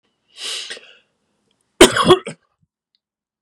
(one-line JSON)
{"cough_length": "3.4 s", "cough_amplitude": 32768, "cough_signal_mean_std_ratio": 0.26, "survey_phase": "beta (2021-08-13 to 2022-03-07)", "age": "18-44", "gender": "Male", "wearing_mask": "No", "symptom_none": true, "symptom_onset": "2 days", "smoker_status": "Never smoked", "respiratory_condition_asthma": false, "respiratory_condition_other": false, "recruitment_source": "REACT", "submission_delay": "0 days", "covid_test_result": "Negative", "covid_test_method": "RT-qPCR"}